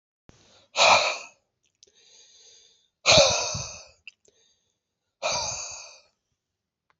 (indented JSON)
{
  "exhalation_length": "7.0 s",
  "exhalation_amplitude": 20493,
  "exhalation_signal_mean_std_ratio": 0.33,
  "survey_phase": "beta (2021-08-13 to 2022-03-07)",
  "age": "18-44",
  "gender": "Male",
  "wearing_mask": "No",
  "symptom_cough_any": true,
  "symptom_runny_or_blocked_nose": true,
  "symptom_sore_throat": true,
  "symptom_fatigue": true,
  "symptom_fever_high_temperature": true,
  "symptom_headache": true,
  "smoker_status": "Never smoked",
  "respiratory_condition_asthma": false,
  "respiratory_condition_other": false,
  "recruitment_source": "Test and Trace",
  "submission_delay": "2 days",
  "covid_test_result": "Positive",
  "covid_test_method": "RT-qPCR",
  "covid_ct_value": 25.7,
  "covid_ct_gene": "ORF1ab gene"
}